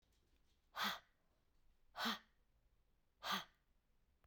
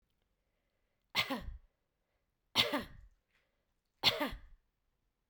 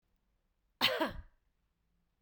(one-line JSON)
{"exhalation_length": "4.3 s", "exhalation_amplitude": 1303, "exhalation_signal_mean_std_ratio": 0.34, "three_cough_length": "5.3 s", "three_cough_amplitude": 6971, "three_cough_signal_mean_std_ratio": 0.3, "cough_length": "2.2 s", "cough_amplitude": 6107, "cough_signal_mean_std_ratio": 0.3, "survey_phase": "beta (2021-08-13 to 2022-03-07)", "age": "45-64", "gender": "Female", "wearing_mask": "No", "symptom_cough_any": true, "symptom_runny_or_blocked_nose": true, "symptom_sore_throat": true, "symptom_fatigue": true, "smoker_status": "Ex-smoker", "respiratory_condition_asthma": false, "respiratory_condition_other": false, "recruitment_source": "REACT", "submission_delay": "1 day", "covid_test_result": "Negative", "covid_test_method": "RT-qPCR", "influenza_a_test_result": "Negative", "influenza_b_test_result": "Negative"}